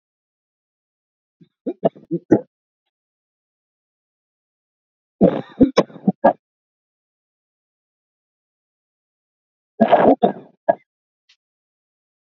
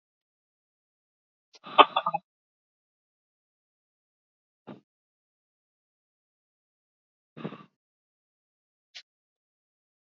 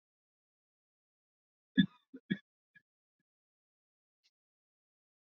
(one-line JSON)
{"three_cough_length": "12.4 s", "three_cough_amplitude": 30962, "three_cough_signal_mean_std_ratio": 0.22, "exhalation_length": "10.1 s", "exhalation_amplitude": 27742, "exhalation_signal_mean_std_ratio": 0.1, "cough_length": "5.3 s", "cough_amplitude": 6360, "cough_signal_mean_std_ratio": 0.11, "survey_phase": "beta (2021-08-13 to 2022-03-07)", "age": "18-44", "gender": "Male", "wearing_mask": "No", "symptom_sore_throat": true, "symptom_fatigue": true, "symptom_headache": true, "symptom_change_to_sense_of_smell_or_taste": true, "symptom_loss_of_taste": true, "symptom_onset": "3 days", "smoker_status": "Ex-smoker", "respiratory_condition_asthma": false, "respiratory_condition_other": false, "recruitment_source": "Test and Trace", "submission_delay": "2 days", "covid_test_result": "Positive", "covid_test_method": "RT-qPCR", "covid_ct_value": 26.7, "covid_ct_gene": "N gene"}